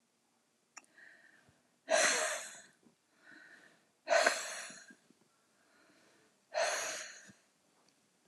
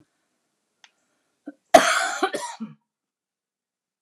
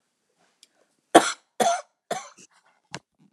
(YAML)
exhalation_length: 8.3 s
exhalation_amplitude: 9327
exhalation_signal_mean_std_ratio: 0.35
cough_length: 4.0 s
cough_amplitude: 29204
cough_signal_mean_std_ratio: 0.25
three_cough_length: 3.3 s
three_cough_amplitude: 29204
three_cough_signal_mean_std_ratio: 0.23
survey_phase: beta (2021-08-13 to 2022-03-07)
age: 45-64
gender: Female
wearing_mask: 'No'
symptom_none: true
smoker_status: Ex-smoker
respiratory_condition_asthma: false
respiratory_condition_other: false
recruitment_source: REACT
submission_delay: 1 day
covid_test_result: Negative
covid_test_method: RT-qPCR
influenza_a_test_result: Negative
influenza_b_test_result: Negative